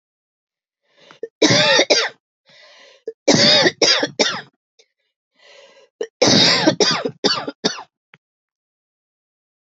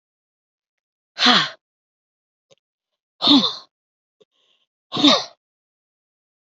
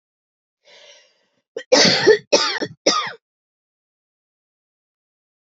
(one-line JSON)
{"three_cough_length": "9.6 s", "three_cough_amplitude": 30724, "three_cough_signal_mean_std_ratio": 0.43, "exhalation_length": "6.5 s", "exhalation_amplitude": 28917, "exhalation_signal_mean_std_ratio": 0.28, "cough_length": "5.5 s", "cough_amplitude": 28260, "cough_signal_mean_std_ratio": 0.32, "survey_phase": "beta (2021-08-13 to 2022-03-07)", "age": "45-64", "gender": "Male", "wearing_mask": "No", "symptom_cough_any": true, "symptom_runny_or_blocked_nose": true, "symptom_sore_throat": true, "symptom_diarrhoea": true, "symptom_fatigue": true, "symptom_fever_high_temperature": true, "symptom_other": true, "smoker_status": "Ex-smoker", "respiratory_condition_asthma": false, "respiratory_condition_other": false, "recruitment_source": "Test and Trace", "submission_delay": "0 days", "covid_test_result": "Positive", "covid_test_method": "RT-qPCR", "covid_ct_value": 27.5, "covid_ct_gene": "ORF1ab gene", "covid_ct_mean": 28.4, "covid_viral_load": "490 copies/ml", "covid_viral_load_category": "Minimal viral load (< 10K copies/ml)"}